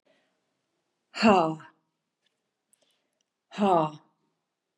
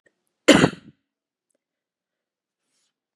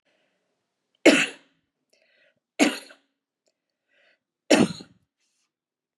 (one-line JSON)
{"exhalation_length": "4.8 s", "exhalation_amplitude": 17004, "exhalation_signal_mean_std_ratio": 0.28, "cough_length": "3.2 s", "cough_amplitude": 32415, "cough_signal_mean_std_ratio": 0.19, "three_cough_length": "6.0 s", "three_cough_amplitude": 27297, "three_cough_signal_mean_std_ratio": 0.22, "survey_phase": "beta (2021-08-13 to 2022-03-07)", "age": "65+", "gender": "Female", "wearing_mask": "No", "symptom_none": true, "smoker_status": "Never smoked", "respiratory_condition_asthma": false, "respiratory_condition_other": false, "recruitment_source": "REACT", "submission_delay": "1 day", "covid_test_result": "Negative", "covid_test_method": "RT-qPCR", "influenza_a_test_result": "Negative", "influenza_b_test_result": "Negative"}